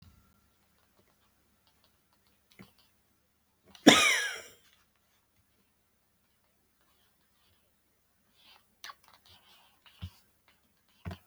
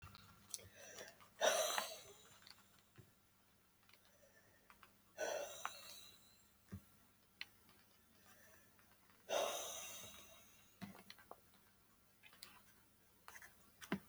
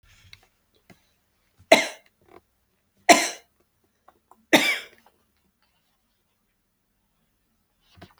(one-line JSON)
{"cough_length": "11.3 s", "cough_amplitude": 27018, "cough_signal_mean_std_ratio": 0.16, "exhalation_length": "14.1 s", "exhalation_amplitude": 2745, "exhalation_signal_mean_std_ratio": 0.39, "three_cough_length": "8.2 s", "three_cough_amplitude": 32145, "three_cough_signal_mean_std_ratio": 0.19, "survey_phase": "beta (2021-08-13 to 2022-03-07)", "age": "65+", "gender": "Female", "wearing_mask": "No", "symptom_none": true, "smoker_status": "Ex-smoker", "respiratory_condition_asthma": true, "respiratory_condition_other": false, "recruitment_source": "REACT", "submission_delay": "0 days", "covid_test_result": "Negative", "covid_test_method": "RT-qPCR", "influenza_a_test_result": "Unknown/Void", "influenza_b_test_result": "Unknown/Void"}